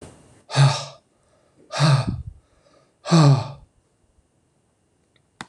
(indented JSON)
{
  "exhalation_length": "5.5 s",
  "exhalation_amplitude": 24517,
  "exhalation_signal_mean_std_ratio": 0.36,
  "survey_phase": "beta (2021-08-13 to 2022-03-07)",
  "age": "45-64",
  "gender": "Male",
  "wearing_mask": "No",
  "symptom_cough_any": true,
  "symptom_runny_or_blocked_nose": true,
  "symptom_shortness_of_breath": true,
  "symptom_sore_throat": true,
  "symptom_fatigue": true,
  "symptom_headache": true,
  "symptom_change_to_sense_of_smell_or_taste": true,
  "symptom_loss_of_taste": true,
  "symptom_onset": "7 days",
  "smoker_status": "Ex-smoker",
  "respiratory_condition_asthma": false,
  "respiratory_condition_other": false,
  "recruitment_source": "Test and Trace",
  "submission_delay": "1 day",
  "covid_test_result": "Positive",
  "covid_test_method": "RT-qPCR",
  "covid_ct_value": 23.3,
  "covid_ct_gene": "ORF1ab gene"
}